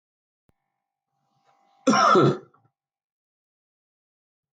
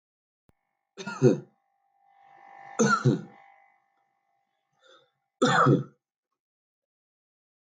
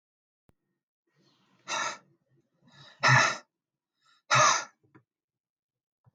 {"cough_length": "4.5 s", "cough_amplitude": 16882, "cough_signal_mean_std_ratio": 0.27, "three_cough_length": "7.8 s", "three_cough_amplitude": 12292, "three_cough_signal_mean_std_ratio": 0.29, "exhalation_length": "6.1 s", "exhalation_amplitude": 11146, "exhalation_signal_mean_std_ratio": 0.29, "survey_phase": "alpha (2021-03-01 to 2021-08-12)", "age": "18-44", "gender": "Male", "wearing_mask": "No", "symptom_none": true, "smoker_status": "Never smoked", "respiratory_condition_asthma": false, "respiratory_condition_other": false, "recruitment_source": "REACT", "submission_delay": "2 days", "covid_test_result": "Negative", "covid_test_method": "RT-qPCR"}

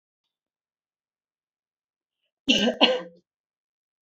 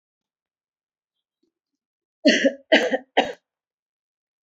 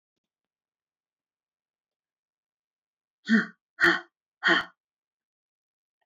{"cough_length": "4.0 s", "cough_amplitude": 25956, "cough_signal_mean_std_ratio": 0.26, "three_cough_length": "4.4 s", "three_cough_amplitude": 23977, "three_cough_signal_mean_std_ratio": 0.27, "exhalation_length": "6.1 s", "exhalation_amplitude": 12438, "exhalation_signal_mean_std_ratio": 0.23, "survey_phase": "beta (2021-08-13 to 2022-03-07)", "age": "18-44", "gender": "Female", "wearing_mask": "No", "symptom_none": true, "smoker_status": "Never smoked", "respiratory_condition_asthma": false, "respiratory_condition_other": false, "recruitment_source": "REACT", "submission_delay": "2 days", "covid_test_result": "Negative", "covid_test_method": "RT-qPCR", "influenza_a_test_result": "Negative", "influenza_b_test_result": "Negative"}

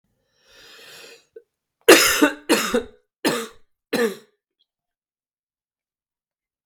{"three_cough_length": "6.7 s", "three_cough_amplitude": 32768, "three_cough_signal_mean_std_ratio": 0.29, "survey_phase": "beta (2021-08-13 to 2022-03-07)", "age": "18-44", "gender": "Male", "wearing_mask": "No", "symptom_new_continuous_cough": true, "symptom_runny_or_blocked_nose": true, "symptom_sore_throat": true, "symptom_fatigue": true, "symptom_headache": true, "symptom_onset": "3 days", "smoker_status": "Never smoked", "respiratory_condition_asthma": false, "respiratory_condition_other": false, "recruitment_source": "Test and Trace", "submission_delay": "2 days", "covid_test_result": "Positive", "covid_test_method": "RT-qPCR", "covid_ct_value": 21.0, "covid_ct_gene": "ORF1ab gene", "covid_ct_mean": 21.6, "covid_viral_load": "79000 copies/ml", "covid_viral_load_category": "Low viral load (10K-1M copies/ml)"}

